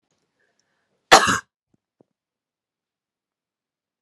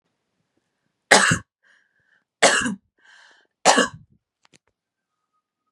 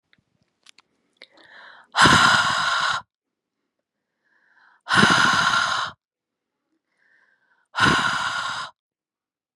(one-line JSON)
{"cough_length": "4.0 s", "cough_amplitude": 32768, "cough_signal_mean_std_ratio": 0.17, "three_cough_length": "5.7 s", "three_cough_amplitude": 32767, "three_cough_signal_mean_std_ratio": 0.28, "exhalation_length": "9.6 s", "exhalation_amplitude": 30381, "exhalation_signal_mean_std_ratio": 0.43, "survey_phase": "beta (2021-08-13 to 2022-03-07)", "age": "18-44", "gender": "Female", "wearing_mask": "No", "symptom_none": true, "smoker_status": "Never smoked", "respiratory_condition_asthma": false, "respiratory_condition_other": false, "recruitment_source": "REACT", "submission_delay": "2 days", "covid_test_result": "Negative", "covid_test_method": "RT-qPCR"}